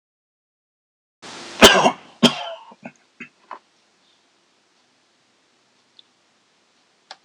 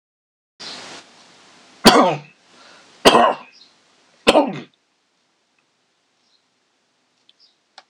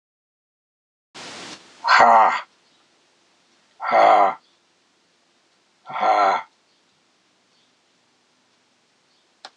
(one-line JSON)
{"cough_length": "7.2 s", "cough_amplitude": 26028, "cough_signal_mean_std_ratio": 0.2, "three_cough_length": "7.9 s", "three_cough_amplitude": 26028, "three_cough_signal_mean_std_ratio": 0.27, "exhalation_length": "9.6 s", "exhalation_amplitude": 26028, "exhalation_signal_mean_std_ratio": 0.33, "survey_phase": "alpha (2021-03-01 to 2021-08-12)", "age": "65+", "gender": "Male", "wearing_mask": "No", "symptom_shortness_of_breath": true, "smoker_status": "Ex-smoker", "respiratory_condition_asthma": false, "respiratory_condition_other": true, "recruitment_source": "REACT", "submission_delay": "2 days", "covid_test_result": "Negative", "covid_test_method": "RT-qPCR"}